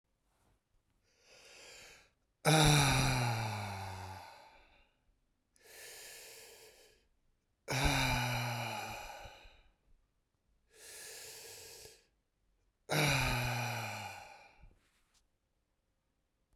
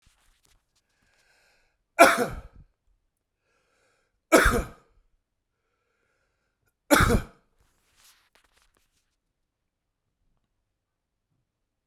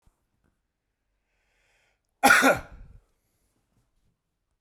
{
  "exhalation_length": "16.6 s",
  "exhalation_amplitude": 6492,
  "exhalation_signal_mean_std_ratio": 0.41,
  "three_cough_length": "11.9 s",
  "three_cough_amplitude": 31025,
  "three_cough_signal_mean_std_ratio": 0.2,
  "cough_length": "4.6 s",
  "cough_amplitude": 21268,
  "cough_signal_mean_std_ratio": 0.22,
  "survey_phase": "beta (2021-08-13 to 2022-03-07)",
  "age": "45-64",
  "gender": "Male",
  "wearing_mask": "No",
  "symptom_none": true,
  "smoker_status": "Never smoked",
  "respiratory_condition_asthma": false,
  "respiratory_condition_other": false,
  "recruitment_source": "REACT",
  "submission_delay": "1 day",
  "covid_test_result": "Negative",
  "covid_test_method": "RT-qPCR"
}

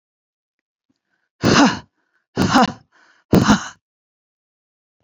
{
  "exhalation_length": "5.0 s",
  "exhalation_amplitude": 31552,
  "exhalation_signal_mean_std_ratio": 0.34,
  "survey_phase": "beta (2021-08-13 to 2022-03-07)",
  "age": "45-64",
  "gender": "Female",
  "wearing_mask": "No",
  "symptom_none": true,
  "smoker_status": "Never smoked",
  "respiratory_condition_asthma": true,
  "respiratory_condition_other": false,
  "recruitment_source": "REACT",
  "submission_delay": "1 day",
  "covid_test_result": "Negative",
  "covid_test_method": "RT-qPCR"
}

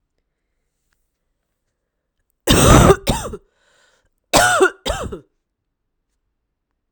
{
  "cough_length": "6.9 s",
  "cough_amplitude": 32768,
  "cough_signal_mean_std_ratio": 0.32,
  "survey_phase": "alpha (2021-03-01 to 2021-08-12)",
  "age": "18-44",
  "gender": "Female",
  "wearing_mask": "No",
  "symptom_cough_any": true,
  "symptom_fatigue": true,
  "symptom_headache": true,
  "symptom_onset": "5 days",
  "smoker_status": "Current smoker (e-cigarettes or vapes only)",
  "respiratory_condition_asthma": false,
  "respiratory_condition_other": false,
  "recruitment_source": "Test and Trace",
  "submission_delay": "2 days",
  "covid_test_result": "Positive",
  "covid_test_method": "ePCR"
}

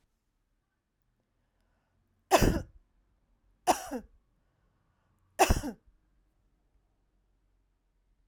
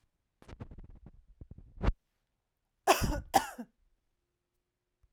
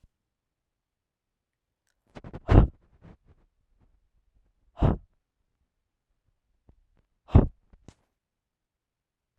{
  "three_cough_length": "8.3 s",
  "three_cough_amplitude": 13659,
  "three_cough_signal_mean_std_ratio": 0.22,
  "cough_length": "5.1 s",
  "cough_amplitude": 10438,
  "cough_signal_mean_std_ratio": 0.27,
  "exhalation_length": "9.4 s",
  "exhalation_amplitude": 26899,
  "exhalation_signal_mean_std_ratio": 0.17,
  "survey_phase": "alpha (2021-03-01 to 2021-08-12)",
  "age": "45-64",
  "gender": "Female",
  "wearing_mask": "No",
  "symptom_none": true,
  "symptom_onset": "12 days",
  "smoker_status": "Never smoked",
  "respiratory_condition_asthma": false,
  "respiratory_condition_other": false,
  "recruitment_source": "REACT",
  "submission_delay": "1 day",
  "covid_test_result": "Negative",
  "covid_test_method": "RT-qPCR"
}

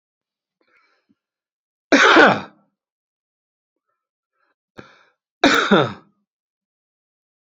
{
  "cough_length": "7.6 s",
  "cough_amplitude": 28765,
  "cough_signal_mean_std_ratio": 0.27,
  "survey_phase": "beta (2021-08-13 to 2022-03-07)",
  "age": "65+",
  "gender": "Male",
  "wearing_mask": "No",
  "symptom_cough_any": true,
  "smoker_status": "Ex-smoker",
  "respiratory_condition_asthma": false,
  "respiratory_condition_other": false,
  "recruitment_source": "REACT",
  "submission_delay": "1 day",
  "covid_test_result": "Negative",
  "covid_test_method": "RT-qPCR"
}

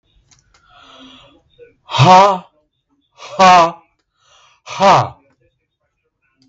{
  "exhalation_length": "6.5 s",
  "exhalation_amplitude": 32768,
  "exhalation_signal_mean_std_ratio": 0.35,
  "survey_phase": "beta (2021-08-13 to 2022-03-07)",
  "age": "45-64",
  "gender": "Male",
  "wearing_mask": "Yes",
  "symptom_none": true,
  "smoker_status": "Ex-smoker",
  "respiratory_condition_asthma": false,
  "respiratory_condition_other": false,
  "recruitment_source": "REACT",
  "submission_delay": "3 days",
  "covid_test_result": "Negative",
  "covid_test_method": "RT-qPCR",
  "influenza_a_test_result": "Negative",
  "influenza_b_test_result": "Negative"
}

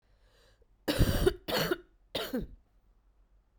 {
  "three_cough_length": "3.6 s",
  "three_cough_amplitude": 7457,
  "three_cough_signal_mean_std_ratio": 0.41,
  "survey_phase": "beta (2021-08-13 to 2022-03-07)",
  "age": "18-44",
  "gender": "Female",
  "wearing_mask": "No",
  "symptom_new_continuous_cough": true,
  "symptom_fatigue": true,
  "symptom_headache": true,
  "symptom_change_to_sense_of_smell_or_taste": true,
  "symptom_loss_of_taste": true,
  "symptom_other": true,
  "symptom_onset": "4 days",
  "smoker_status": "Current smoker (e-cigarettes or vapes only)",
  "respiratory_condition_asthma": false,
  "respiratory_condition_other": false,
  "recruitment_source": "Test and Trace",
  "submission_delay": "2 days",
  "covid_test_result": "Positive",
  "covid_test_method": "RT-qPCR",
  "covid_ct_value": 15.9,
  "covid_ct_gene": "N gene",
  "covid_ct_mean": 16.3,
  "covid_viral_load": "4500000 copies/ml",
  "covid_viral_load_category": "High viral load (>1M copies/ml)"
}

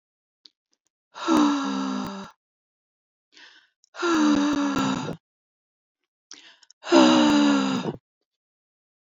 {
  "exhalation_length": "9.0 s",
  "exhalation_amplitude": 24671,
  "exhalation_signal_mean_std_ratio": 0.48,
  "survey_phase": "beta (2021-08-13 to 2022-03-07)",
  "age": "45-64",
  "gender": "Female",
  "wearing_mask": "No",
  "symptom_cough_any": true,
  "symptom_runny_or_blocked_nose": true,
  "symptom_shortness_of_breath": true,
  "symptom_sore_throat": true,
  "symptom_fatigue": true,
  "symptom_headache": true,
  "symptom_change_to_sense_of_smell_or_taste": true,
  "symptom_onset": "7 days",
  "smoker_status": "Never smoked",
  "respiratory_condition_asthma": true,
  "respiratory_condition_other": true,
  "recruitment_source": "Test and Trace",
  "submission_delay": "2 days",
  "covid_test_result": "Positive",
  "covid_test_method": "ePCR"
}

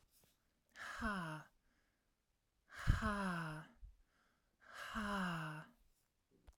{
  "exhalation_length": "6.6 s",
  "exhalation_amplitude": 3015,
  "exhalation_signal_mean_std_ratio": 0.46,
  "survey_phase": "alpha (2021-03-01 to 2021-08-12)",
  "age": "45-64",
  "gender": "Female",
  "wearing_mask": "No",
  "symptom_none": true,
  "smoker_status": "Ex-smoker",
  "respiratory_condition_asthma": false,
  "respiratory_condition_other": false,
  "recruitment_source": "REACT",
  "submission_delay": "2 days",
  "covid_test_result": "Negative",
  "covid_test_method": "RT-qPCR"
}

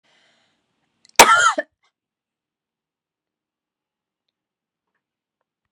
{
  "cough_length": "5.7 s",
  "cough_amplitude": 32768,
  "cough_signal_mean_std_ratio": 0.18,
  "survey_phase": "beta (2021-08-13 to 2022-03-07)",
  "age": "18-44",
  "gender": "Female",
  "wearing_mask": "No",
  "symptom_runny_or_blocked_nose": true,
  "symptom_fatigue": true,
  "smoker_status": "Never smoked",
  "respiratory_condition_asthma": false,
  "respiratory_condition_other": false,
  "recruitment_source": "Test and Trace",
  "submission_delay": "1 day",
  "covid_test_result": "Positive",
  "covid_test_method": "RT-qPCR",
  "covid_ct_value": 17.0,
  "covid_ct_gene": "ORF1ab gene",
  "covid_ct_mean": 17.2,
  "covid_viral_load": "2200000 copies/ml",
  "covid_viral_load_category": "High viral load (>1M copies/ml)"
}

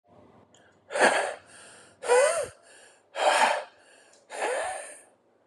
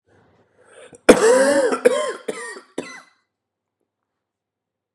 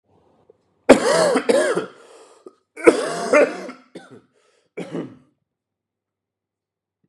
{
  "exhalation_length": "5.5 s",
  "exhalation_amplitude": 13976,
  "exhalation_signal_mean_std_ratio": 0.47,
  "cough_length": "4.9 s",
  "cough_amplitude": 32768,
  "cough_signal_mean_std_ratio": 0.36,
  "three_cough_length": "7.1 s",
  "three_cough_amplitude": 32768,
  "three_cough_signal_mean_std_ratio": 0.35,
  "survey_phase": "beta (2021-08-13 to 2022-03-07)",
  "age": "18-44",
  "gender": "Male",
  "wearing_mask": "No",
  "symptom_cough_any": true,
  "symptom_runny_or_blocked_nose": true,
  "symptom_fatigue": true,
  "symptom_fever_high_temperature": true,
  "symptom_change_to_sense_of_smell_or_taste": true,
  "symptom_onset": "3 days",
  "smoker_status": "Ex-smoker",
  "respiratory_condition_asthma": false,
  "respiratory_condition_other": false,
  "recruitment_source": "Test and Trace",
  "submission_delay": "1 day",
  "covid_test_result": "Positive",
  "covid_test_method": "RT-qPCR"
}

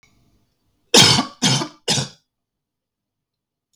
{
  "three_cough_length": "3.8 s",
  "three_cough_amplitude": 32768,
  "three_cough_signal_mean_std_ratio": 0.32,
  "survey_phase": "beta (2021-08-13 to 2022-03-07)",
  "age": "18-44",
  "gender": "Male",
  "wearing_mask": "No",
  "symptom_none": true,
  "symptom_onset": "12 days",
  "smoker_status": "Never smoked",
  "respiratory_condition_asthma": false,
  "respiratory_condition_other": false,
  "recruitment_source": "REACT",
  "submission_delay": "6 days",
  "covid_test_result": "Negative",
  "covid_test_method": "RT-qPCR"
}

